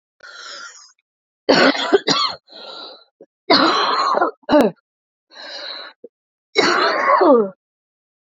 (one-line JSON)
{"three_cough_length": "8.4 s", "three_cough_amplitude": 30595, "three_cough_signal_mean_std_ratio": 0.49, "survey_phase": "beta (2021-08-13 to 2022-03-07)", "age": "18-44", "gender": "Female", "wearing_mask": "No", "symptom_cough_any": true, "symptom_runny_or_blocked_nose": true, "symptom_sore_throat": true, "symptom_fatigue": true, "symptom_headache": true, "symptom_onset": "2 days", "smoker_status": "Ex-smoker", "respiratory_condition_asthma": true, "respiratory_condition_other": false, "recruitment_source": "Test and Trace", "submission_delay": "1 day", "covid_test_result": "Positive", "covid_test_method": "RT-qPCR", "covid_ct_value": 21.7, "covid_ct_gene": "ORF1ab gene"}